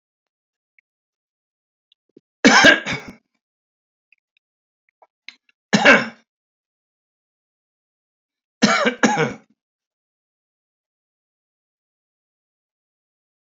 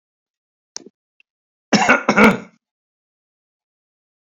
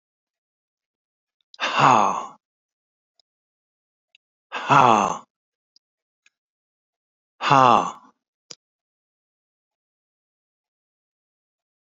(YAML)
three_cough_length: 13.5 s
three_cough_amplitude: 31385
three_cough_signal_mean_std_ratio: 0.23
cough_length: 4.3 s
cough_amplitude: 30267
cough_signal_mean_std_ratio: 0.27
exhalation_length: 11.9 s
exhalation_amplitude: 28323
exhalation_signal_mean_std_ratio: 0.25
survey_phase: beta (2021-08-13 to 2022-03-07)
age: 65+
gender: Male
wearing_mask: 'No'
symptom_cough_any: true
smoker_status: Ex-smoker
respiratory_condition_asthma: false
respiratory_condition_other: false
recruitment_source: REACT
submission_delay: 1 day
covid_test_result: Negative
covid_test_method: RT-qPCR